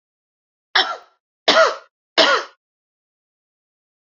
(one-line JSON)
{"three_cough_length": "4.1 s", "three_cough_amplitude": 30851, "three_cough_signal_mean_std_ratio": 0.31, "survey_phase": "beta (2021-08-13 to 2022-03-07)", "age": "45-64", "gender": "Female", "wearing_mask": "No", "symptom_cough_any": true, "smoker_status": "Never smoked", "respiratory_condition_asthma": true, "respiratory_condition_other": false, "recruitment_source": "Test and Trace", "submission_delay": "2 days", "covid_test_result": "Positive", "covid_test_method": "RT-qPCR", "covid_ct_value": 35.3, "covid_ct_gene": "ORF1ab gene"}